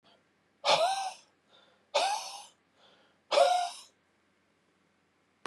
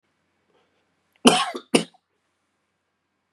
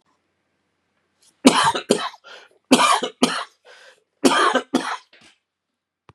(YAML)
exhalation_length: 5.5 s
exhalation_amplitude: 8500
exhalation_signal_mean_std_ratio: 0.38
cough_length: 3.3 s
cough_amplitude: 32721
cough_signal_mean_std_ratio: 0.22
three_cough_length: 6.1 s
three_cough_amplitude: 32768
three_cough_signal_mean_std_ratio: 0.38
survey_phase: beta (2021-08-13 to 2022-03-07)
age: 45-64
gender: Male
wearing_mask: 'No'
symptom_cough_any: true
symptom_runny_or_blocked_nose: true
symptom_shortness_of_breath: true
symptom_sore_throat: true
smoker_status: Never smoked
respiratory_condition_asthma: false
respiratory_condition_other: false
recruitment_source: Test and Trace
submission_delay: 1 day
covid_test_result: Positive
covid_test_method: RT-qPCR